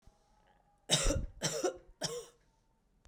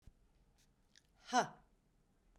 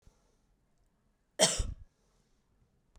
{"three_cough_length": "3.1 s", "three_cough_amplitude": 6533, "three_cough_signal_mean_std_ratio": 0.43, "exhalation_length": "2.4 s", "exhalation_amplitude": 3650, "exhalation_signal_mean_std_ratio": 0.22, "cough_length": "3.0 s", "cough_amplitude": 10758, "cough_signal_mean_std_ratio": 0.24, "survey_phase": "beta (2021-08-13 to 2022-03-07)", "age": "45-64", "gender": "Female", "wearing_mask": "No", "symptom_none": true, "smoker_status": "Never smoked", "respiratory_condition_asthma": false, "respiratory_condition_other": false, "recruitment_source": "REACT", "submission_delay": "1 day", "covid_test_result": "Negative", "covid_test_method": "RT-qPCR", "influenza_a_test_result": "Unknown/Void", "influenza_b_test_result": "Unknown/Void"}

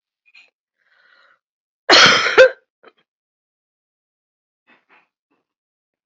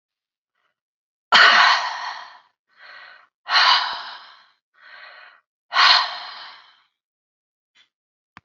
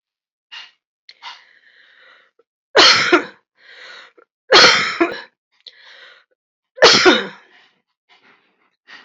{"cough_length": "6.1 s", "cough_amplitude": 30266, "cough_signal_mean_std_ratio": 0.24, "exhalation_length": "8.4 s", "exhalation_amplitude": 29909, "exhalation_signal_mean_std_ratio": 0.35, "three_cough_length": "9.0 s", "three_cough_amplitude": 32767, "three_cough_signal_mean_std_ratio": 0.32, "survey_phase": "beta (2021-08-13 to 2022-03-07)", "age": "65+", "gender": "Female", "wearing_mask": "No", "symptom_none": true, "smoker_status": "Ex-smoker", "respiratory_condition_asthma": false, "respiratory_condition_other": false, "recruitment_source": "REACT", "submission_delay": "6 days", "covid_test_result": "Negative", "covid_test_method": "RT-qPCR", "influenza_a_test_result": "Negative", "influenza_b_test_result": "Negative"}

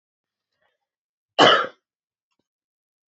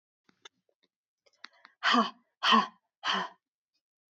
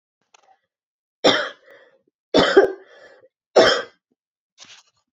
{"cough_length": "3.1 s", "cough_amplitude": 27163, "cough_signal_mean_std_ratio": 0.23, "exhalation_length": "4.1 s", "exhalation_amplitude": 10157, "exhalation_signal_mean_std_ratio": 0.32, "three_cough_length": "5.1 s", "three_cough_amplitude": 30869, "three_cough_signal_mean_std_ratio": 0.31, "survey_phase": "beta (2021-08-13 to 2022-03-07)", "age": "18-44", "gender": "Female", "wearing_mask": "No", "symptom_cough_any": true, "symptom_new_continuous_cough": true, "symptom_runny_or_blocked_nose": true, "symptom_fatigue": true, "symptom_change_to_sense_of_smell_or_taste": true, "symptom_loss_of_taste": true, "smoker_status": "Ex-smoker", "respiratory_condition_asthma": false, "respiratory_condition_other": false, "recruitment_source": "Test and Trace", "submission_delay": "2 days", "covid_test_result": "Positive", "covid_test_method": "RT-qPCR", "covid_ct_value": 20.2, "covid_ct_gene": "ORF1ab gene", "covid_ct_mean": 21.0, "covid_viral_load": "130000 copies/ml", "covid_viral_load_category": "Low viral load (10K-1M copies/ml)"}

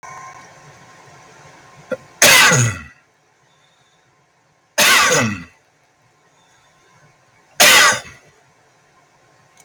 {"three_cough_length": "9.6 s", "three_cough_amplitude": 32768, "three_cough_signal_mean_std_ratio": 0.34, "survey_phase": "beta (2021-08-13 to 2022-03-07)", "age": "45-64", "gender": "Male", "wearing_mask": "No", "symptom_none": true, "smoker_status": "Ex-smoker", "respiratory_condition_asthma": false, "respiratory_condition_other": false, "recruitment_source": "REACT", "submission_delay": "4 days", "covid_test_result": "Negative", "covid_test_method": "RT-qPCR", "influenza_a_test_result": "Negative", "influenza_b_test_result": "Negative"}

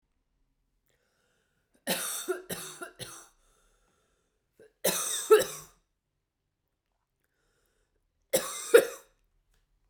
{"three_cough_length": "9.9 s", "three_cough_amplitude": 19335, "three_cough_signal_mean_std_ratio": 0.24, "survey_phase": "beta (2021-08-13 to 2022-03-07)", "age": "18-44", "gender": "Female", "wearing_mask": "No", "symptom_runny_or_blocked_nose": true, "symptom_headache": true, "smoker_status": "Never smoked", "respiratory_condition_asthma": true, "respiratory_condition_other": false, "recruitment_source": "Test and Trace", "submission_delay": "2 days", "covid_test_result": "Positive", "covid_test_method": "RT-qPCR"}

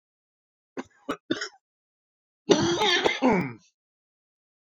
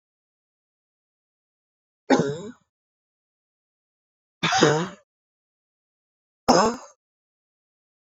{"cough_length": "4.8 s", "cough_amplitude": 24021, "cough_signal_mean_std_ratio": 0.38, "three_cough_length": "8.2 s", "three_cough_amplitude": 24025, "three_cough_signal_mean_std_ratio": 0.26, "survey_phase": "beta (2021-08-13 to 2022-03-07)", "age": "45-64", "gender": "Male", "wearing_mask": "No", "symptom_none": true, "smoker_status": "Never smoked", "respiratory_condition_asthma": false, "respiratory_condition_other": false, "recruitment_source": "REACT", "submission_delay": "1 day", "covid_test_result": "Negative", "covid_test_method": "RT-qPCR", "influenza_a_test_result": "Negative", "influenza_b_test_result": "Negative"}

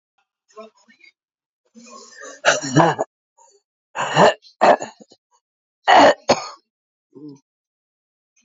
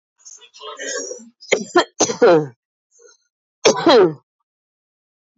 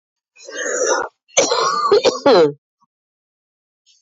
{"exhalation_length": "8.4 s", "exhalation_amplitude": 27127, "exhalation_signal_mean_std_ratio": 0.32, "three_cough_length": "5.4 s", "three_cough_amplitude": 29774, "three_cough_signal_mean_std_ratio": 0.39, "cough_length": "4.0 s", "cough_amplitude": 30585, "cough_signal_mean_std_ratio": 0.52, "survey_phase": "beta (2021-08-13 to 2022-03-07)", "age": "45-64", "gender": "Female", "wearing_mask": "No", "symptom_cough_any": true, "symptom_runny_or_blocked_nose": true, "symptom_shortness_of_breath": true, "symptom_sore_throat": true, "symptom_fatigue": true, "symptom_fever_high_temperature": true, "symptom_headache": true, "symptom_change_to_sense_of_smell_or_taste": true, "symptom_other": true, "symptom_onset": "2 days", "smoker_status": "Never smoked", "respiratory_condition_asthma": false, "respiratory_condition_other": false, "recruitment_source": "Test and Trace", "submission_delay": "2 days", "covid_test_result": "Positive", "covid_test_method": "RT-qPCR"}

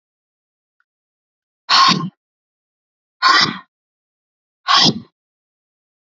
{"exhalation_length": "6.1 s", "exhalation_amplitude": 32768, "exhalation_signal_mean_std_ratio": 0.31, "survey_phase": "alpha (2021-03-01 to 2021-08-12)", "age": "18-44", "gender": "Female", "wearing_mask": "No", "symptom_cough_any": true, "symptom_new_continuous_cough": true, "symptom_fatigue": true, "symptom_fever_high_temperature": true, "symptom_headache": true, "symptom_change_to_sense_of_smell_or_taste": true, "symptom_onset": "3 days", "smoker_status": "Ex-smoker", "respiratory_condition_asthma": false, "respiratory_condition_other": false, "recruitment_source": "Test and Trace", "submission_delay": "2 days", "covid_test_result": "Positive", "covid_test_method": "RT-qPCR", "covid_ct_value": 16.0, "covid_ct_gene": "ORF1ab gene", "covid_ct_mean": 16.4, "covid_viral_load": "4200000 copies/ml", "covid_viral_load_category": "High viral load (>1M copies/ml)"}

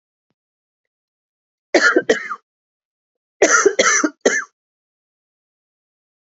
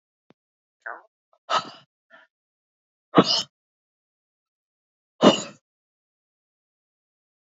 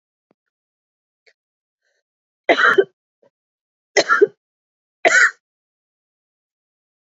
{"cough_length": "6.3 s", "cough_amplitude": 28754, "cough_signal_mean_std_ratio": 0.33, "exhalation_length": "7.4 s", "exhalation_amplitude": 31408, "exhalation_signal_mean_std_ratio": 0.19, "three_cough_length": "7.2 s", "three_cough_amplitude": 32599, "three_cough_signal_mean_std_ratio": 0.26, "survey_phase": "beta (2021-08-13 to 2022-03-07)", "age": "45-64", "gender": "Female", "wearing_mask": "No", "symptom_cough_any": true, "symptom_new_continuous_cough": true, "symptom_runny_or_blocked_nose": true, "symptom_sore_throat": true, "symptom_fatigue": true, "symptom_fever_high_temperature": true, "symptom_headache": true, "symptom_change_to_sense_of_smell_or_taste": true, "symptom_other": true, "symptom_onset": "3 days", "smoker_status": "Never smoked", "respiratory_condition_asthma": false, "respiratory_condition_other": false, "recruitment_source": "Test and Trace", "submission_delay": "2 days", "covid_test_result": "Positive", "covid_test_method": "RT-qPCR", "covid_ct_value": 13.9, "covid_ct_gene": "ORF1ab gene", "covid_ct_mean": 14.9, "covid_viral_load": "13000000 copies/ml", "covid_viral_load_category": "High viral load (>1M copies/ml)"}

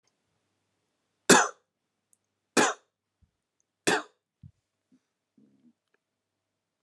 {"three_cough_length": "6.8 s", "three_cough_amplitude": 24364, "three_cough_signal_mean_std_ratio": 0.19, "survey_phase": "alpha (2021-03-01 to 2021-08-12)", "age": "18-44", "gender": "Male", "wearing_mask": "No", "symptom_none": true, "smoker_status": "Never smoked", "respiratory_condition_asthma": false, "respiratory_condition_other": false, "recruitment_source": "REACT", "submission_delay": "1 day", "covid_test_result": "Negative", "covid_test_method": "RT-qPCR"}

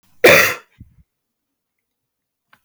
{"cough_length": "2.6 s", "cough_amplitude": 32768, "cough_signal_mean_std_ratio": 0.27, "survey_phase": "beta (2021-08-13 to 2022-03-07)", "age": "45-64", "gender": "Female", "wearing_mask": "No", "symptom_cough_any": true, "symptom_runny_or_blocked_nose": true, "symptom_shortness_of_breath": true, "symptom_sore_throat": true, "symptom_fatigue": true, "symptom_headache": true, "symptom_other": true, "symptom_onset": "2 days", "smoker_status": "Current smoker (1 to 10 cigarettes per day)", "respiratory_condition_asthma": false, "respiratory_condition_other": false, "recruitment_source": "Test and Trace", "submission_delay": "2 days", "covid_test_result": "Positive", "covid_test_method": "LAMP"}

